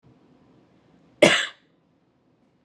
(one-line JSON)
{"cough_length": "2.6 s", "cough_amplitude": 30261, "cough_signal_mean_std_ratio": 0.22, "survey_phase": "alpha (2021-03-01 to 2021-08-12)", "age": "18-44", "gender": "Female", "wearing_mask": "Yes", "symptom_none": true, "smoker_status": "Never smoked", "respiratory_condition_asthma": false, "respiratory_condition_other": false, "recruitment_source": "REACT", "submission_delay": "1 day", "covid_test_result": "Negative", "covid_test_method": "RT-qPCR"}